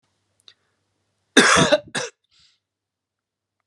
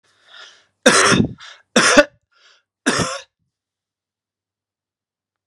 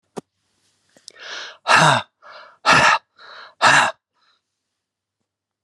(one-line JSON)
{"cough_length": "3.7 s", "cough_amplitude": 32723, "cough_signal_mean_std_ratio": 0.28, "three_cough_length": "5.5 s", "three_cough_amplitude": 32768, "three_cough_signal_mean_std_ratio": 0.33, "exhalation_length": "5.6 s", "exhalation_amplitude": 32064, "exhalation_signal_mean_std_ratio": 0.36, "survey_phase": "beta (2021-08-13 to 2022-03-07)", "age": "45-64", "gender": "Male", "wearing_mask": "No", "symptom_runny_or_blocked_nose": true, "smoker_status": "Never smoked", "respiratory_condition_asthma": false, "respiratory_condition_other": false, "recruitment_source": "REACT", "submission_delay": "1 day", "covid_test_result": "Negative", "covid_test_method": "RT-qPCR", "influenza_a_test_result": "Negative", "influenza_b_test_result": "Negative"}